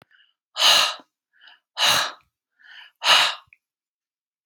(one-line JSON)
{"exhalation_length": "4.5 s", "exhalation_amplitude": 23457, "exhalation_signal_mean_std_ratio": 0.37, "survey_phase": "beta (2021-08-13 to 2022-03-07)", "age": "45-64", "gender": "Female", "wearing_mask": "No", "symptom_none": true, "smoker_status": "Never smoked", "respiratory_condition_asthma": false, "respiratory_condition_other": false, "recruitment_source": "REACT", "submission_delay": "1 day", "covid_test_result": "Negative", "covid_test_method": "RT-qPCR"}